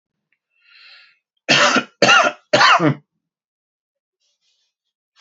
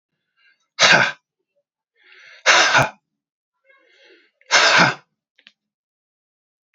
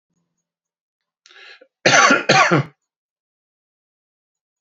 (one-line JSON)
{"three_cough_length": "5.2 s", "three_cough_amplitude": 32767, "three_cough_signal_mean_std_ratio": 0.36, "exhalation_length": "6.7 s", "exhalation_amplitude": 32768, "exhalation_signal_mean_std_ratio": 0.34, "cough_length": "4.6 s", "cough_amplitude": 31121, "cough_signal_mean_std_ratio": 0.32, "survey_phase": "alpha (2021-03-01 to 2021-08-12)", "age": "45-64", "gender": "Male", "wearing_mask": "No", "symptom_none": true, "smoker_status": "Ex-smoker", "respiratory_condition_asthma": false, "respiratory_condition_other": false, "recruitment_source": "REACT", "submission_delay": "2 days", "covid_test_result": "Negative", "covid_test_method": "RT-qPCR"}